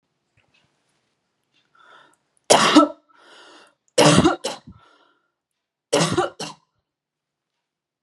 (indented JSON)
{
  "three_cough_length": "8.0 s",
  "three_cough_amplitude": 32767,
  "three_cough_signal_mean_std_ratio": 0.3,
  "survey_phase": "beta (2021-08-13 to 2022-03-07)",
  "age": "18-44",
  "gender": "Female",
  "wearing_mask": "No",
  "symptom_runny_or_blocked_nose": true,
  "symptom_shortness_of_breath": true,
  "symptom_headache": true,
  "symptom_loss_of_taste": true,
  "symptom_onset": "5 days",
  "smoker_status": "Never smoked",
  "respiratory_condition_asthma": false,
  "respiratory_condition_other": false,
  "recruitment_source": "Test and Trace",
  "submission_delay": "1 day",
  "covid_test_result": "Positive",
  "covid_test_method": "ePCR"
}